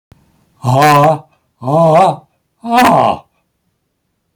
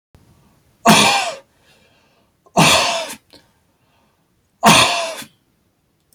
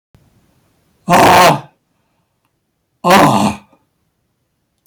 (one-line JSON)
{"exhalation_length": "4.4 s", "exhalation_amplitude": 32768, "exhalation_signal_mean_std_ratio": 0.54, "three_cough_length": "6.1 s", "three_cough_amplitude": 32768, "three_cough_signal_mean_std_ratio": 0.38, "cough_length": "4.9 s", "cough_amplitude": 32768, "cough_signal_mean_std_ratio": 0.39, "survey_phase": "beta (2021-08-13 to 2022-03-07)", "age": "65+", "gender": "Male", "wearing_mask": "No", "symptom_none": true, "smoker_status": "Never smoked", "respiratory_condition_asthma": false, "respiratory_condition_other": false, "recruitment_source": "REACT", "submission_delay": "1 day", "covid_test_result": "Negative", "covid_test_method": "RT-qPCR"}